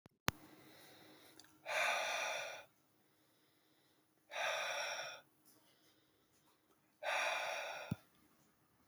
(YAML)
exhalation_length: 8.9 s
exhalation_amplitude: 7930
exhalation_signal_mean_std_ratio: 0.48
survey_phase: beta (2021-08-13 to 2022-03-07)
age: 18-44
gender: Male
wearing_mask: 'No'
symptom_cough_any: true
symptom_shortness_of_breath: true
symptom_fatigue: true
symptom_change_to_sense_of_smell_or_taste: true
symptom_loss_of_taste: true
symptom_onset: 4 days
smoker_status: Never smoked
respiratory_condition_asthma: false
respiratory_condition_other: false
recruitment_source: Test and Trace
submission_delay: 2 days
covid_test_result: Positive
covid_test_method: RT-qPCR
covid_ct_value: 17.9
covid_ct_gene: ORF1ab gene
covid_ct_mean: 18.4
covid_viral_load: 960000 copies/ml
covid_viral_load_category: Low viral load (10K-1M copies/ml)